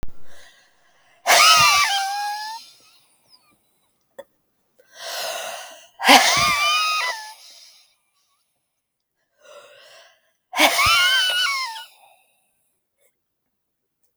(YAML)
exhalation_length: 14.2 s
exhalation_amplitude: 32768
exhalation_signal_mean_std_ratio: 0.43
survey_phase: beta (2021-08-13 to 2022-03-07)
age: 45-64
gender: Female
wearing_mask: 'No'
symptom_none: true
smoker_status: Never smoked
respiratory_condition_asthma: false
respiratory_condition_other: false
recruitment_source: REACT
submission_delay: 2 days
covid_test_result: Negative
covid_test_method: RT-qPCR